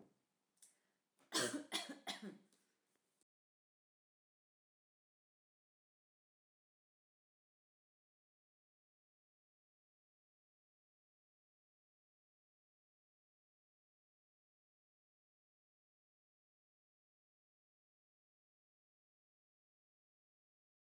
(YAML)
three_cough_length: 20.8 s
three_cough_amplitude: 1593
three_cough_signal_mean_std_ratio: 0.14
survey_phase: beta (2021-08-13 to 2022-03-07)
age: 45-64
gender: Female
wearing_mask: 'No'
symptom_runny_or_blocked_nose: true
symptom_fatigue: true
smoker_status: Never smoked
respiratory_condition_asthma: false
respiratory_condition_other: false
recruitment_source: Test and Trace
submission_delay: 1 day
covid_test_result: Negative
covid_test_method: RT-qPCR